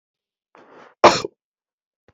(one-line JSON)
{"cough_length": "2.1 s", "cough_amplitude": 32767, "cough_signal_mean_std_ratio": 0.2, "survey_phase": "beta (2021-08-13 to 2022-03-07)", "age": "18-44", "gender": "Male", "wearing_mask": "Yes", "symptom_cough_any": true, "symptom_runny_or_blocked_nose": true, "symptom_sore_throat": true, "symptom_fever_high_temperature": true, "symptom_headache": true, "smoker_status": "Never smoked", "respiratory_condition_asthma": false, "respiratory_condition_other": false, "recruitment_source": "Test and Trace", "submission_delay": "2 days", "covid_test_result": "Positive", "covid_test_method": "RT-qPCR", "covid_ct_value": 14.1, "covid_ct_gene": "ORF1ab gene", "covid_ct_mean": 14.2, "covid_viral_load": "21000000 copies/ml", "covid_viral_load_category": "High viral load (>1M copies/ml)"}